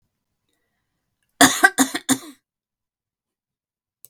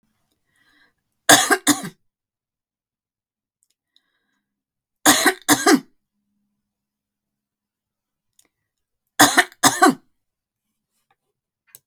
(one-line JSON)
{"cough_length": "4.1 s", "cough_amplitude": 32768, "cough_signal_mean_std_ratio": 0.23, "three_cough_length": "11.9 s", "three_cough_amplitude": 32766, "three_cough_signal_mean_std_ratio": 0.25, "survey_phase": "beta (2021-08-13 to 2022-03-07)", "age": "45-64", "gender": "Female", "wearing_mask": "No", "symptom_none": true, "symptom_onset": "7 days", "smoker_status": "Ex-smoker", "respiratory_condition_asthma": false, "respiratory_condition_other": false, "recruitment_source": "REACT", "submission_delay": "1 day", "covid_test_result": "Negative", "covid_test_method": "RT-qPCR", "influenza_a_test_result": "Unknown/Void", "influenza_b_test_result": "Unknown/Void"}